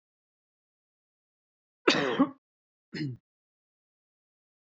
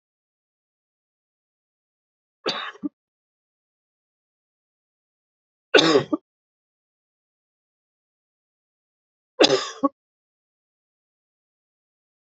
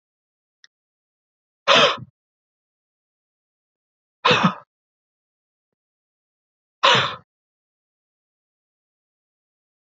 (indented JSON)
{
  "cough_length": "4.6 s",
  "cough_amplitude": 14139,
  "cough_signal_mean_std_ratio": 0.25,
  "three_cough_length": "12.4 s",
  "three_cough_amplitude": 32371,
  "three_cough_signal_mean_std_ratio": 0.18,
  "exhalation_length": "9.8 s",
  "exhalation_amplitude": 27293,
  "exhalation_signal_mean_std_ratio": 0.22,
  "survey_phase": "beta (2021-08-13 to 2022-03-07)",
  "age": "45-64",
  "gender": "Male",
  "wearing_mask": "No",
  "symptom_new_continuous_cough": true,
  "symptom_runny_or_blocked_nose": true,
  "symptom_fatigue": true,
  "symptom_other": true,
  "symptom_onset": "5 days",
  "smoker_status": "Never smoked",
  "respiratory_condition_asthma": false,
  "respiratory_condition_other": false,
  "recruitment_source": "REACT",
  "submission_delay": "1 day",
  "covid_test_result": "Positive",
  "covid_test_method": "RT-qPCR",
  "covid_ct_value": 18.5,
  "covid_ct_gene": "E gene",
  "influenza_a_test_result": "Negative",
  "influenza_b_test_result": "Negative"
}